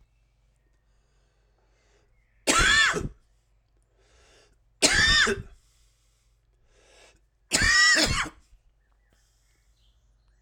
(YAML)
three_cough_length: 10.4 s
three_cough_amplitude: 21938
three_cough_signal_mean_std_ratio: 0.36
survey_phase: alpha (2021-03-01 to 2021-08-12)
age: 45-64
gender: Male
wearing_mask: 'No'
symptom_cough_any: true
symptom_fatigue: true
symptom_change_to_sense_of_smell_or_taste: true
symptom_onset: 3 days
smoker_status: Ex-smoker
respiratory_condition_asthma: false
respiratory_condition_other: false
recruitment_source: Test and Trace
submission_delay: 2 days
covid_test_result: Positive
covid_test_method: RT-qPCR